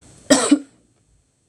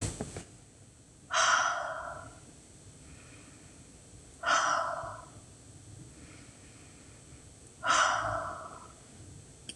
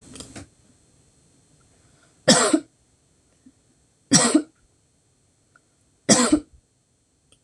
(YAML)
cough_length: 1.5 s
cough_amplitude: 26028
cough_signal_mean_std_ratio: 0.33
exhalation_length: 9.8 s
exhalation_amplitude: 6905
exhalation_signal_mean_std_ratio: 0.49
three_cough_length: 7.4 s
three_cough_amplitude: 26022
three_cough_signal_mean_std_ratio: 0.28
survey_phase: beta (2021-08-13 to 2022-03-07)
age: 45-64
gender: Female
wearing_mask: 'No'
symptom_none: true
smoker_status: Never smoked
respiratory_condition_asthma: false
respiratory_condition_other: false
recruitment_source: REACT
submission_delay: 3 days
covid_test_result: Negative
covid_test_method: RT-qPCR
influenza_a_test_result: Negative
influenza_b_test_result: Negative